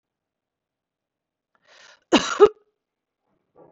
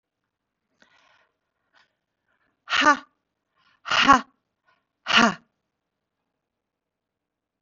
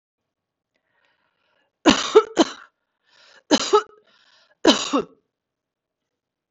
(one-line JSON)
{"cough_length": "3.7 s", "cough_amplitude": 25112, "cough_signal_mean_std_ratio": 0.19, "exhalation_length": "7.6 s", "exhalation_amplitude": 32628, "exhalation_signal_mean_std_ratio": 0.23, "three_cough_length": "6.5 s", "three_cough_amplitude": 32768, "three_cough_signal_mean_std_ratio": 0.27, "survey_phase": "beta (2021-08-13 to 2022-03-07)", "age": "45-64", "gender": "Female", "wearing_mask": "No", "symptom_runny_or_blocked_nose": true, "symptom_abdominal_pain": true, "symptom_fatigue": true, "symptom_onset": "8 days", "smoker_status": "Current smoker (1 to 10 cigarettes per day)", "respiratory_condition_asthma": false, "respiratory_condition_other": false, "recruitment_source": "REACT", "submission_delay": "1 day", "covid_test_result": "Negative", "covid_test_method": "RT-qPCR", "influenza_a_test_result": "Negative", "influenza_b_test_result": "Negative"}